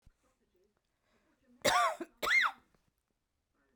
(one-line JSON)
{"cough_length": "3.8 s", "cough_amplitude": 8375, "cough_signal_mean_std_ratio": 0.34, "survey_phase": "beta (2021-08-13 to 2022-03-07)", "age": "45-64", "gender": "Female", "wearing_mask": "No", "symptom_sore_throat": true, "symptom_headache": true, "symptom_onset": "12 days", "smoker_status": "Current smoker (11 or more cigarettes per day)", "respiratory_condition_asthma": false, "respiratory_condition_other": false, "recruitment_source": "REACT", "submission_delay": "1 day", "covid_test_result": "Negative", "covid_test_method": "RT-qPCR"}